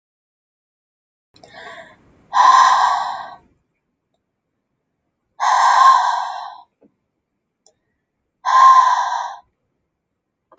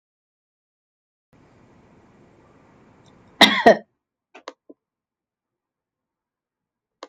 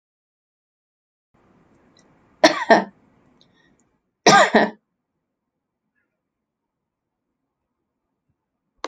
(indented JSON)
{
  "exhalation_length": "10.6 s",
  "exhalation_amplitude": 28654,
  "exhalation_signal_mean_std_ratio": 0.4,
  "cough_length": "7.1 s",
  "cough_amplitude": 29999,
  "cough_signal_mean_std_ratio": 0.16,
  "three_cough_length": "8.9 s",
  "three_cough_amplitude": 32768,
  "three_cough_signal_mean_std_ratio": 0.21,
  "survey_phase": "alpha (2021-03-01 to 2021-08-12)",
  "age": "45-64",
  "gender": "Female",
  "wearing_mask": "No",
  "symptom_none": true,
  "smoker_status": "Never smoked",
  "respiratory_condition_asthma": false,
  "respiratory_condition_other": false,
  "recruitment_source": "REACT",
  "submission_delay": "3 days",
  "covid_test_result": "Negative",
  "covid_test_method": "RT-qPCR"
}